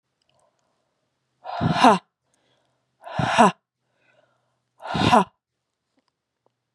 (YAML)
exhalation_length: 6.7 s
exhalation_amplitude: 30066
exhalation_signal_mean_std_ratio: 0.29
survey_phase: beta (2021-08-13 to 2022-03-07)
age: 18-44
gender: Female
wearing_mask: 'No'
symptom_cough_any: true
symptom_new_continuous_cough: true
symptom_runny_or_blocked_nose: true
symptom_sore_throat: true
symptom_fatigue: true
symptom_headache: true
symptom_change_to_sense_of_smell_or_taste: true
smoker_status: Never smoked
respiratory_condition_asthma: true
respiratory_condition_other: false
recruitment_source: Test and Trace
submission_delay: 12 days
covid_test_result: Negative
covid_test_method: RT-qPCR